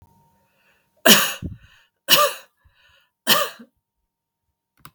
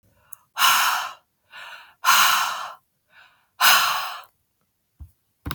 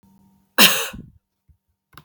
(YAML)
three_cough_length: 4.9 s
three_cough_amplitude: 32768
three_cough_signal_mean_std_ratio: 0.29
exhalation_length: 5.5 s
exhalation_amplitude: 26209
exhalation_signal_mean_std_ratio: 0.44
cough_length: 2.0 s
cough_amplitude: 32768
cough_signal_mean_std_ratio: 0.27
survey_phase: beta (2021-08-13 to 2022-03-07)
age: 18-44
gender: Female
wearing_mask: 'No'
symptom_shortness_of_breath: true
symptom_sore_throat: true
symptom_fatigue: true
symptom_change_to_sense_of_smell_or_taste: true
symptom_other: true
smoker_status: Never smoked
respiratory_condition_asthma: false
respiratory_condition_other: false
recruitment_source: Test and Trace
submission_delay: 2 days
covid_test_result: Positive
covid_test_method: ePCR